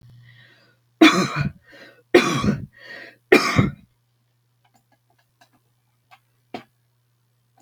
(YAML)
three_cough_length: 7.6 s
three_cough_amplitude: 32768
three_cough_signal_mean_std_ratio: 0.29
survey_phase: beta (2021-08-13 to 2022-03-07)
age: 65+
gender: Female
wearing_mask: 'No'
symptom_none: true
smoker_status: Ex-smoker
respiratory_condition_asthma: false
respiratory_condition_other: false
recruitment_source: REACT
submission_delay: 1 day
covid_test_result: Negative
covid_test_method: RT-qPCR
influenza_a_test_result: Negative
influenza_b_test_result: Negative